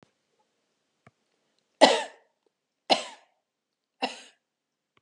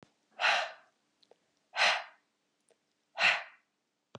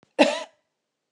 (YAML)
three_cough_length: 5.0 s
three_cough_amplitude: 26373
three_cough_signal_mean_std_ratio: 0.19
exhalation_length: 4.2 s
exhalation_amplitude: 6907
exhalation_signal_mean_std_ratio: 0.34
cough_length: 1.1 s
cough_amplitude: 23570
cough_signal_mean_std_ratio: 0.3
survey_phase: beta (2021-08-13 to 2022-03-07)
age: 45-64
gender: Female
wearing_mask: 'No'
symptom_none: true
smoker_status: Ex-smoker
respiratory_condition_asthma: false
respiratory_condition_other: false
recruitment_source: REACT
submission_delay: 0 days
covid_test_result: Negative
covid_test_method: RT-qPCR
covid_ct_value: 45.0
covid_ct_gene: N gene